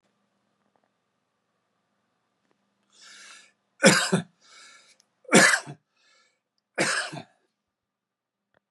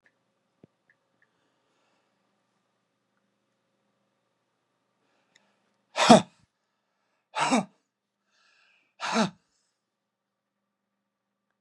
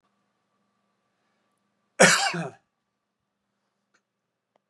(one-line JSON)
{"three_cough_length": "8.7 s", "three_cough_amplitude": 27274, "three_cough_signal_mean_std_ratio": 0.24, "exhalation_length": "11.6 s", "exhalation_amplitude": 30437, "exhalation_signal_mean_std_ratio": 0.16, "cough_length": "4.7 s", "cough_amplitude": 24911, "cough_signal_mean_std_ratio": 0.21, "survey_phase": "beta (2021-08-13 to 2022-03-07)", "age": "65+", "gender": "Male", "wearing_mask": "No", "symptom_none": true, "smoker_status": "Never smoked", "respiratory_condition_asthma": false, "respiratory_condition_other": false, "recruitment_source": "REACT", "submission_delay": "8 days", "covid_test_result": "Negative", "covid_test_method": "RT-qPCR", "influenza_a_test_result": "Negative", "influenza_b_test_result": "Negative"}